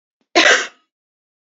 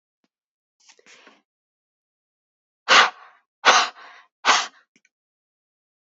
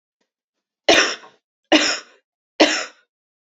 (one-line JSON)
{"cough_length": "1.5 s", "cough_amplitude": 30731, "cough_signal_mean_std_ratio": 0.34, "exhalation_length": "6.1 s", "exhalation_amplitude": 28715, "exhalation_signal_mean_std_ratio": 0.25, "three_cough_length": "3.6 s", "three_cough_amplitude": 32767, "three_cough_signal_mean_std_ratio": 0.34, "survey_phase": "beta (2021-08-13 to 2022-03-07)", "age": "45-64", "gender": "Female", "wearing_mask": "No", "symptom_none": true, "smoker_status": "Never smoked", "respiratory_condition_asthma": false, "respiratory_condition_other": false, "recruitment_source": "REACT", "submission_delay": "1 day", "covid_test_result": "Negative", "covid_test_method": "RT-qPCR", "influenza_a_test_result": "Unknown/Void", "influenza_b_test_result": "Unknown/Void"}